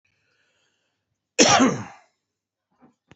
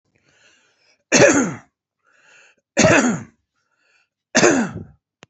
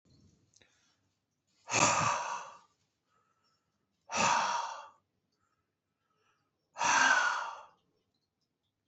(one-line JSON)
{"cough_length": "3.2 s", "cough_amplitude": 27045, "cough_signal_mean_std_ratio": 0.28, "three_cough_length": "5.3 s", "three_cough_amplitude": 32767, "three_cough_signal_mean_std_ratio": 0.38, "exhalation_length": "8.9 s", "exhalation_amplitude": 9737, "exhalation_signal_mean_std_ratio": 0.39, "survey_phase": "beta (2021-08-13 to 2022-03-07)", "age": "45-64", "gender": "Male", "wearing_mask": "No", "symptom_none": true, "symptom_onset": "6 days", "smoker_status": "Current smoker (e-cigarettes or vapes only)", "respiratory_condition_asthma": false, "respiratory_condition_other": false, "recruitment_source": "REACT", "submission_delay": "1 day", "covid_test_result": "Negative", "covid_test_method": "RT-qPCR", "influenza_a_test_result": "Negative", "influenza_b_test_result": "Negative"}